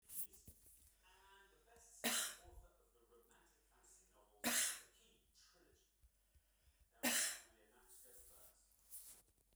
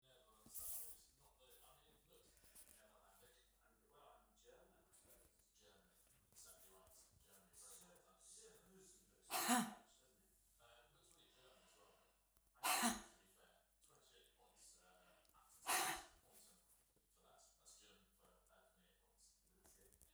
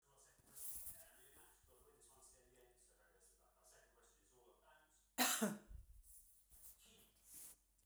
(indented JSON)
{
  "three_cough_length": "9.6 s",
  "three_cough_amplitude": 1856,
  "three_cough_signal_mean_std_ratio": 0.35,
  "exhalation_length": "20.1 s",
  "exhalation_amplitude": 1716,
  "exhalation_signal_mean_std_ratio": 0.29,
  "cough_length": "7.9 s",
  "cough_amplitude": 2375,
  "cough_signal_mean_std_ratio": 0.32,
  "survey_phase": "beta (2021-08-13 to 2022-03-07)",
  "age": "65+",
  "gender": "Female",
  "wearing_mask": "No",
  "symptom_fatigue": true,
  "smoker_status": "Never smoked",
  "respiratory_condition_asthma": false,
  "respiratory_condition_other": false,
  "recruitment_source": "REACT",
  "submission_delay": "1 day",
  "covid_test_result": "Negative",
  "covid_test_method": "RT-qPCR"
}